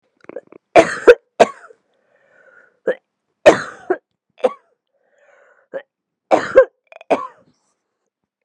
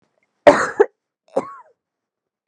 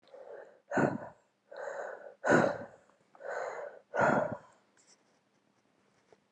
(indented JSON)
{
  "three_cough_length": "8.4 s",
  "three_cough_amplitude": 32768,
  "three_cough_signal_mean_std_ratio": 0.25,
  "cough_length": "2.5 s",
  "cough_amplitude": 32768,
  "cough_signal_mean_std_ratio": 0.25,
  "exhalation_length": "6.3 s",
  "exhalation_amplitude": 7324,
  "exhalation_signal_mean_std_ratio": 0.4,
  "survey_phase": "beta (2021-08-13 to 2022-03-07)",
  "age": "45-64",
  "gender": "Female",
  "wearing_mask": "No",
  "symptom_cough_any": true,
  "symptom_runny_or_blocked_nose": true,
  "symptom_headache": true,
  "smoker_status": "Never smoked",
  "respiratory_condition_asthma": true,
  "respiratory_condition_other": false,
  "recruitment_source": "Test and Trace",
  "submission_delay": "1 day",
  "covid_test_result": "Positive",
  "covid_test_method": "RT-qPCR",
  "covid_ct_value": 15.9,
  "covid_ct_gene": "ORF1ab gene",
  "covid_ct_mean": 16.8,
  "covid_viral_load": "3100000 copies/ml",
  "covid_viral_load_category": "High viral load (>1M copies/ml)"
}